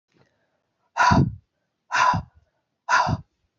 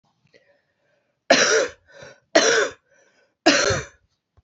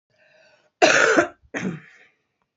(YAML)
exhalation_length: 3.6 s
exhalation_amplitude: 16261
exhalation_signal_mean_std_ratio: 0.42
three_cough_length: 4.4 s
three_cough_amplitude: 27812
three_cough_signal_mean_std_ratio: 0.4
cough_length: 2.6 s
cough_amplitude: 32539
cough_signal_mean_std_ratio: 0.38
survey_phase: beta (2021-08-13 to 2022-03-07)
age: 45-64
gender: Female
wearing_mask: 'No'
symptom_cough_any: true
symptom_new_continuous_cough: true
symptom_runny_or_blocked_nose: true
symptom_shortness_of_breath: true
symptom_sore_throat: true
symptom_change_to_sense_of_smell_or_taste: true
symptom_loss_of_taste: true
symptom_onset: 7 days
smoker_status: Never smoked
respiratory_condition_asthma: true
respiratory_condition_other: false
recruitment_source: Test and Trace
submission_delay: 2 days
covid_test_result: Positive
covid_test_method: RT-qPCR
covid_ct_value: 18.5
covid_ct_gene: S gene
covid_ct_mean: 18.6
covid_viral_load: 820000 copies/ml
covid_viral_load_category: Low viral load (10K-1M copies/ml)